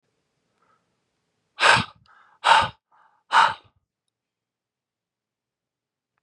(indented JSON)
{
  "exhalation_length": "6.2 s",
  "exhalation_amplitude": 26061,
  "exhalation_signal_mean_std_ratio": 0.25,
  "survey_phase": "beta (2021-08-13 to 2022-03-07)",
  "age": "18-44",
  "gender": "Male",
  "wearing_mask": "No",
  "symptom_cough_any": true,
  "symptom_runny_or_blocked_nose": true,
  "symptom_fatigue": true,
  "symptom_other": true,
  "smoker_status": "Never smoked",
  "respiratory_condition_asthma": false,
  "respiratory_condition_other": false,
  "recruitment_source": "Test and Trace",
  "submission_delay": "1 day",
  "covid_test_result": "Positive",
  "covid_test_method": "RT-qPCR",
  "covid_ct_value": 27.1,
  "covid_ct_gene": "N gene"
}